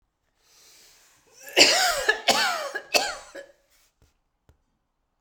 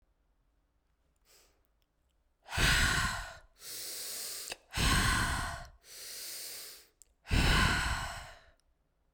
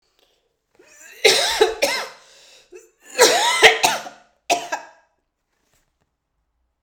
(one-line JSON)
{"cough_length": "5.2 s", "cough_amplitude": 32767, "cough_signal_mean_std_ratio": 0.37, "exhalation_length": "9.1 s", "exhalation_amplitude": 5566, "exhalation_signal_mean_std_ratio": 0.5, "three_cough_length": "6.8 s", "three_cough_amplitude": 32768, "three_cough_signal_mean_std_ratio": 0.37, "survey_phase": "beta (2021-08-13 to 2022-03-07)", "age": "18-44", "gender": "Female", "wearing_mask": "No", "symptom_cough_any": true, "symptom_runny_or_blocked_nose": true, "symptom_shortness_of_breath": true, "symptom_sore_throat": true, "symptom_fatigue": true, "symptom_headache": true, "symptom_change_to_sense_of_smell_or_taste": true, "symptom_loss_of_taste": true, "smoker_status": "Never smoked", "respiratory_condition_asthma": false, "respiratory_condition_other": false, "recruitment_source": "REACT", "submission_delay": "3 days", "covid_test_result": "Positive", "covid_test_method": "RT-qPCR", "covid_ct_value": 19.0, "covid_ct_gene": "E gene"}